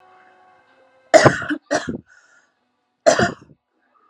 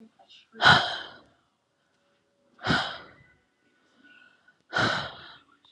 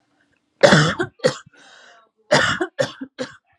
{"three_cough_length": "4.1 s", "three_cough_amplitude": 32768, "three_cough_signal_mean_std_ratio": 0.3, "exhalation_length": "5.7 s", "exhalation_amplitude": 20093, "exhalation_signal_mean_std_ratio": 0.31, "cough_length": "3.6 s", "cough_amplitude": 32768, "cough_signal_mean_std_ratio": 0.39, "survey_phase": "alpha (2021-03-01 to 2021-08-12)", "age": "18-44", "gender": "Female", "wearing_mask": "No", "symptom_cough_any": true, "symptom_shortness_of_breath": true, "symptom_fatigue": true, "symptom_fever_high_temperature": true, "symptom_headache": true, "smoker_status": "Current smoker (e-cigarettes or vapes only)", "respiratory_condition_asthma": true, "respiratory_condition_other": false, "recruitment_source": "Test and Trace", "submission_delay": "1 day", "covid_test_result": "Positive", "covid_test_method": "RT-qPCR", "covid_ct_value": 35.6, "covid_ct_gene": "ORF1ab gene", "covid_ct_mean": 36.0, "covid_viral_load": "1.6 copies/ml", "covid_viral_load_category": "Minimal viral load (< 10K copies/ml)"}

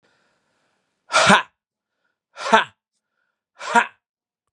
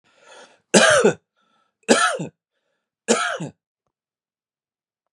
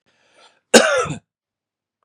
{"exhalation_length": "4.5 s", "exhalation_amplitude": 32767, "exhalation_signal_mean_std_ratio": 0.27, "three_cough_length": "5.1 s", "three_cough_amplitude": 32474, "three_cough_signal_mean_std_ratio": 0.34, "cough_length": "2.0 s", "cough_amplitude": 32768, "cough_signal_mean_std_ratio": 0.3, "survey_phase": "beta (2021-08-13 to 2022-03-07)", "age": "45-64", "gender": "Male", "wearing_mask": "No", "symptom_none": true, "smoker_status": "Never smoked", "respiratory_condition_asthma": false, "respiratory_condition_other": false, "recruitment_source": "REACT", "submission_delay": "0 days", "covid_test_result": "Negative", "covid_test_method": "RT-qPCR", "influenza_a_test_result": "Negative", "influenza_b_test_result": "Negative"}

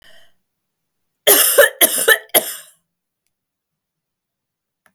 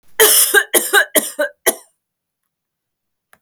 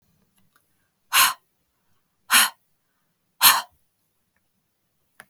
{"three_cough_length": "4.9 s", "three_cough_amplitude": 32768, "three_cough_signal_mean_std_ratio": 0.32, "cough_length": "3.4 s", "cough_amplitude": 32768, "cough_signal_mean_std_ratio": 0.42, "exhalation_length": "5.3 s", "exhalation_amplitude": 31677, "exhalation_signal_mean_std_ratio": 0.25, "survey_phase": "beta (2021-08-13 to 2022-03-07)", "age": "45-64", "gender": "Female", "wearing_mask": "No", "symptom_none": true, "smoker_status": "Never smoked", "respiratory_condition_asthma": false, "respiratory_condition_other": false, "recruitment_source": "REACT", "submission_delay": "2 days", "covid_test_result": "Negative", "covid_test_method": "RT-qPCR", "influenza_a_test_result": "Negative", "influenza_b_test_result": "Negative"}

